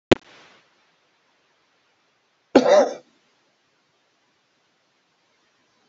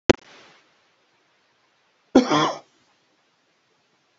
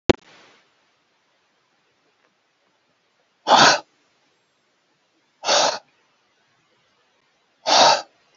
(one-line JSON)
{"cough_length": "5.9 s", "cough_amplitude": 31297, "cough_signal_mean_std_ratio": 0.2, "three_cough_length": "4.2 s", "three_cough_amplitude": 31293, "three_cough_signal_mean_std_ratio": 0.22, "exhalation_length": "8.4 s", "exhalation_amplitude": 32767, "exhalation_signal_mean_std_ratio": 0.26, "survey_phase": "beta (2021-08-13 to 2022-03-07)", "age": "65+", "gender": "Male", "wearing_mask": "No", "symptom_none": true, "smoker_status": "Ex-smoker", "respiratory_condition_asthma": false, "respiratory_condition_other": false, "recruitment_source": "REACT", "submission_delay": "1 day", "covid_test_result": "Negative", "covid_test_method": "RT-qPCR"}